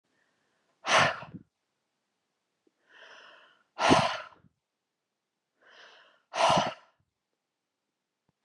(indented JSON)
{
  "exhalation_length": "8.4 s",
  "exhalation_amplitude": 12716,
  "exhalation_signal_mean_std_ratio": 0.28,
  "survey_phase": "beta (2021-08-13 to 2022-03-07)",
  "age": "18-44",
  "gender": "Female",
  "wearing_mask": "No",
  "symptom_none": true,
  "smoker_status": "Ex-smoker",
  "respiratory_condition_asthma": false,
  "respiratory_condition_other": false,
  "recruitment_source": "REACT",
  "submission_delay": "2 days",
  "covid_test_result": "Negative",
  "covid_test_method": "RT-qPCR"
}